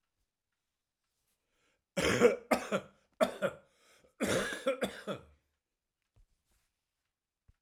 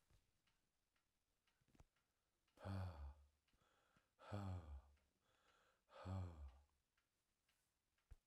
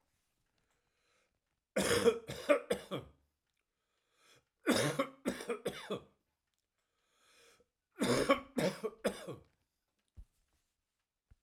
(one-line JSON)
{"cough_length": "7.6 s", "cough_amplitude": 7935, "cough_signal_mean_std_ratio": 0.33, "exhalation_length": "8.3 s", "exhalation_amplitude": 496, "exhalation_signal_mean_std_ratio": 0.4, "three_cough_length": "11.4 s", "three_cough_amplitude": 6443, "three_cough_signal_mean_std_ratio": 0.35, "survey_phase": "alpha (2021-03-01 to 2021-08-12)", "age": "65+", "gender": "Male", "wearing_mask": "No", "symptom_none": true, "smoker_status": "Never smoked", "respiratory_condition_asthma": false, "respiratory_condition_other": false, "recruitment_source": "REACT", "submission_delay": "1 day", "covid_test_result": "Negative", "covid_test_method": "RT-qPCR"}